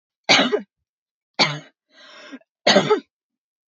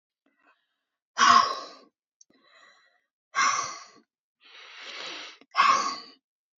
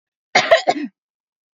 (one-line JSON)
{"three_cough_length": "3.8 s", "three_cough_amplitude": 31317, "three_cough_signal_mean_std_ratio": 0.35, "exhalation_length": "6.6 s", "exhalation_amplitude": 16834, "exhalation_signal_mean_std_ratio": 0.34, "cough_length": "1.5 s", "cough_amplitude": 28322, "cough_signal_mean_std_ratio": 0.36, "survey_phase": "beta (2021-08-13 to 2022-03-07)", "age": "18-44", "gender": "Female", "wearing_mask": "No", "symptom_none": true, "smoker_status": "Never smoked", "respiratory_condition_asthma": true, "respiratory_condition_other": false, "recruitment_source": "REACT", "submission_delay": "1 day", "covid_test_result": "Negative", "covid_test_method": "RT-qPCR"}